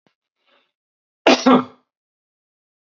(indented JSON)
{
  "cough_length": "3.0 s",
  "cough_amplitude": 32767,
  "cough_signal_mean_std_ratio": 0.24,
  "survey_phase": "beta (2021-08-13 to 2022-03-07)",
  "age": "45-64",
  "gender": "Male",
  "wearing_mask": "No",
  "symptom_cough_any": true,
  "smoker_status": "Ex-smoker",
  "respiratory_condition_asthma": false,
  "respiratory_condition_other": false,
  "recruitment_source": "REACT",
  "submission_delay": "1 day",
  "covid_test_result": "Negative",
  "covid_test_method": "RT-qPCR"
}